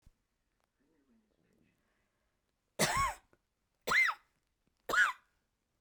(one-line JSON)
{"three_cough_length": "5.8 s", "three_cough_amplitude": 4769, "three_cough_signal_mean_std_ratio": 0.31, "survey_phase": "beta (2021-08-13 to 2022-03-07)", "age": "45-64", "gender": "Female", "wearing_mask": "No", "symptom_sore_throat": true, "symptom_headache": true, "symptom_onset": "12 days", "smoker_status": "Current smoker (11 or more cigarettes per day)", "respiratory_condition_asthma": false, "respiratory_condition_other": false, "recruitment_source": "REACT", "submission_delay": "1 day", "covid_test_result": "Negative", "covid_test_method": "RT-qPCR"}